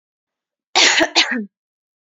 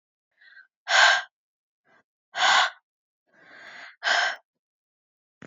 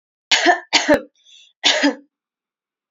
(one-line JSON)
{"cough_length": "2.0 s", "cough_amplitude": 32768, "cough_signal_mean_std_ratio": 0.42, "exhalation_length": "5.5 s", "exhalation_amplitude": 19422, "exhalation_signal_mean_std_ratio": 0.34, "three_cough_length": "2.9 s", "three_cough_amplitude": 28662, "three_cough_signal_mean_std_ratio": 0.42, "survey_phase": "beta (2021-08-13 to 2022-03-07)", "age": "18-44", "gender": "Female", "wearing_mask": "No", "symptom_none": true, "smoker_status": "Ex-smoker", "respiratory_condition_asthma": false, "respiratory_condition_other": false, "recruitment_source": "REACT", "submission_delay": "1 day", "covid_test_result": "Negative", "covid_test_method": "RT-qPCR", "influenza_a_test_result": "Negative", "influenza_b_test_result": "Negative"}